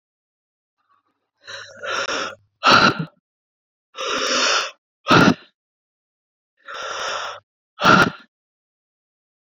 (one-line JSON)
{"exhalation_length": "9.6 s", "exhalation_amplitude": 29228, "exhalation_signal_mean_std_ratio": 0.37, "survey_phase": "beta (2021-08-13 to 2022-03-07)", "age": "45-64", "gender": "Male", "wearing_mask": "No", "symptom_cough_any": true, "symptom_runny_or_blocked_nose": true, "symptom_sore_throat": true, "symptom_fatigue": true, "symptom_fever_high_temperature": true, "symptom_change_to_sense_of_smell_or_taste": true, "symptom_loss_of_taste": true, "symptom_onset": "3 days", "smoker_status": "Never smoked", "respiratory_condition_asthma": false, "respiratory_condition_other": false, "recruitment_source": "Test and Trace", "submission_delay": "2 days", "covid_test_result": "Positive", "covid_test_method": "RT-qPCR", "covid_ct_value": 19.7, "covid_ct_gene": "ORF1ab gene"}